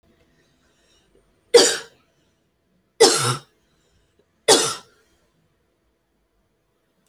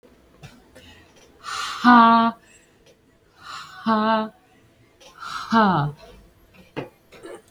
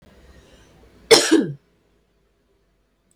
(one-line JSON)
{"three_cough_length": "7.1 s", "three_cough_amplitude": 32768, "three_cough_signal_mean_std_ratio": 0.25, "exhalation_length": "7.5 s", "exhalation_amplitude": 25717, "exhalation_signal_mean_std_ratio": 0.39, "cough_length": "3.2 s", "cough_amplitude": 32198, "cough_signal_mean_std_ratio": 0.26, "survey_phase": "alpha (2021-03-01 to 2021-08-12)", "age": "18-44", "gender": "Female", "wearing_mask": "No", "symptom_none": true, "smoker_status": "Never smoked", "respiratory_condition_asthma": true, "respiratory_condition_other": false, "recruitment_source": "REACT", "submission_delay": "1 day", "covid_test_result": "Negative", "covid_test_method": "RT-qPCR"}